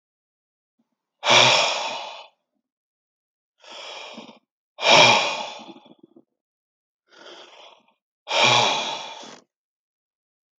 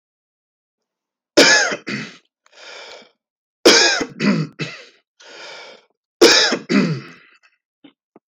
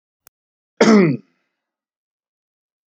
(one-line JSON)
{"exhalation_length": "10.6 s", "exhalation_amplitude": 29296, "exhalation_signal_mean_std_ratio": 0.35, "three_cough_length": "8.3 s", "three_cough_amplitude": 31361, "three_cough_signal_mean_std_ratio": 0.38, "cough_length": "2.9 s", "cough_amplitude": 30354, "cough_signal_mean_std_ratio": 0.28, "survey_phase": "beta (2021-08-13 to 2022-03-07)", "age": "45-64", "gender": "Male", "wearing_mask": "No", "symptom_none": true, "smoker_status": "Never smoked", "respiratory_condition_asthma": false, "respiratory_condition_other": false, "recruitment_source": "REACT", "submission_delay": "2 days", "covid_test_result": "Negative", "covid_test_method": "RT-qPCR"}